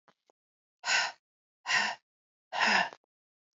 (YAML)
exhalation_length: 3.6 s
exhalation_amplitude: 9477
exhalation_signal_mean_std_ratio: 0.39
survey_phase: beta (2021-08-13 to 2022-03-07)
age: 18-44
gender: Female
wearing_mask: 'No'
symptom_cough_any: true
symptom_runny_or_blocked_nose: true
symptom_sore_throat: true
symptom_fatigue: true
symptom_headache: true
smoker_status: Ex-smoker
respiratory_condition_asthma: false
respiratory_condition_other: false
recruitment_source: Test and Trace
submission_delay: 2 days
covid_test_result: Positive
covid_test_method: RT-qPCR
covid_ct_value: 19.5
covid_ct_gene: ORF1ab gene
covid_ct_mean: 19.7
covid_viral_load: 340000 copies/ml
covid_viral_load_category: Low viral load (10K-1M copies/ml)